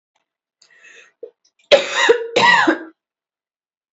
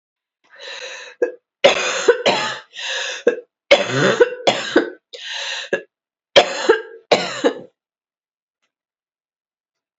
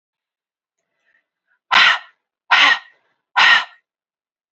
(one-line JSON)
{"cough_length": "3.9 s", "cough_amplitude": 30005, "cough_signal_mean_std_ratio": 0.38, "three_cough_length": "10.0 s", "three_cough_amplitude": 32767, "three_cough_signal_mean_std_ratio": 0.42, "exhalation_length": "4.5 s", "exhalation_amplitude": 32166, "exhalation_signal_mean_std_ratio": 0.34, "survey_phase": "beta (2021-08-13 to 2022-03-07)", "age": "18-44", "gender": "Female", "wearing_mask": "No", "symptom_cough_any": true, "symptom_runny_or_blocked_nose": true, "symptom_sore_throat": true, "symptom_fatigue": true, "symptom_headache": true, "symptom_other": true, "symptom_onset": "2 days", "smoker_status": "Never smoked", "respiratory_condition_asthma": true, "respiratory_condition_other": false, "recruitment_source": "Test and Trace", "submission_delay": "1 day", "covid_test_result": "Positive", "covid_test_method": "RT-qPCR", "covid_ct_value": 20.6, "covid_ct_gene": "ORF1ab gene", "covid_ct_mean": 20.8, "covid_viral_load": "150000 copies/ml", "covid_viral_load_category": "Low viral load (10K-1M copies/ml)"}